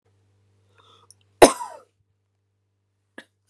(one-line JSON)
{"cough_length": "3.5 s", "cough_amplitude": 32768, "cough_signal_mean_std_ratio": 0.13, "survey_phase": "beta (2021-08-13 to 2022-03-07)", "age": "18-44", "gender": "Female", "wearing_mask": "No", "symptom_cough_any": true, "symptom_new_continuous_cough": true, "symptom_runny_or_blocked_nose": true, "symptom_shortness_of_breath": true, "symptom_sore_throat": true, "symptom_fatigue": true, "symptom_fever_high_temperature": true, "symptom_headache": true, "symptom_other": true, "symptom_onset": "2 days", "smoker_status": "Never smoked", "respiratory_condition_asthma": false, "respiratory_condition_other": false, "recruitment_source": "Test and Trace", "submission_delay": "1 day", "covid_test_result": "Negative", "covid_test_method": "RT-qPCR"}